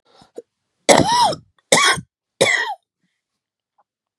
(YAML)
three_cough_length: 4.2 s
three_cough_amplitude: 32768
three_cough_signal_mean_std_ratio: 0.39
survey_phase: beta (2021-08-13 to 2022-03-07)
age: 45-64
gender: Female
wearing_mask: 'No'
symptom_cough_any: true
symptom_runny_or_blocked_nose: true
symptom_sore_throat: true
symptom_fatigue: true
symptom_headache: true
symptom_change_to_sense_of_smell_or_taste: true
symptom_loss_of_taste: true
symptom_onset: 4 days
smoker_status: Ex-smoker
respiratory_condition_asthma: false
respiratory_condition_other: false
recruitment_source: Test and Trace
submission_delay: 2 days
covid_test_result: Positive
covid_test_method: RT-qPCR
covid_ct_value: 20.8
covid_ct_gene: ORF1ab gene